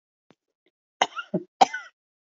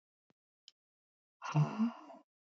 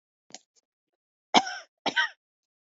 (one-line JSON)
{"cough_length": "2.4 s", "cough_amplitude": 25392, "cough_signal_mean_std_ratio": 0.2, "exhalation_length": "2.6 s", "exhalation_amplitude": 2816, "exhalation_signal_mean_std_ratio": 0.33, "three_cough_length": "2.7 s", "three_cough_amplitude": 23633, "three_cough_signal_mean_std_ratio": 0.24, "survey_phase": "beta (2021-08-13 to 2022-03-07)", "age": "45-64", "gender": "Female", "wearing_mask": "No", "symptom_cough_any": true, "symptom_headache": true, "symptom_change_to_sense_of_smell_or_taste": true, "symptom_onset": "2 days", "smoker_status": "Never smoked", "respiratory_condition_asthma": false, "respiratory_condition_other": false, "recruitment_source": "Test and Trace", "submission_delay": "1 day", "covid_test_result": "Positive", "covid_test_method": "RT-qPCR", "covid_ct_value": 19.2, "covid_ct_gene": "ORF1ab gene"}